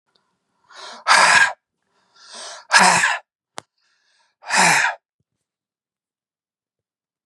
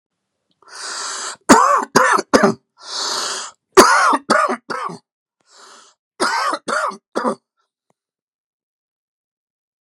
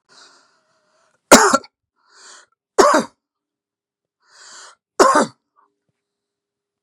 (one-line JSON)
{"exhalation_length": "7.3 s", "exhalation_amplitude": 31827, "exhalation_signal_mean_std_ratio": 0.35, "three_cough_length": "9.8 s", "three_cough_amplitude": 32768, "three_cough_signal_mean_std_ratio": 0.42, "cough_length": "6.8 s", "cough_amplitude": 32768, "cough_signal_mean_std_ratio": 0.26, "survey_phase": "beta (2021-08-13 to 2022-03-07)", "age": "45-64", "gender": "Male", "wearing_mask": "No", "symptom_fatigue": true, "symptom_headache": true, "smoker_status": "Never smoked", "respiratory_condition_asthma": false, "respiratory_condition_other": false, "recruitment_source": "REACT", "submission_delay": "2 days", "covid_test_result": "Negative", "covid_test_method": "RT-qPCR", "influenza_a_test_result": "Unknown/Void", "influenza_b_test_result": "Unknown/Void"}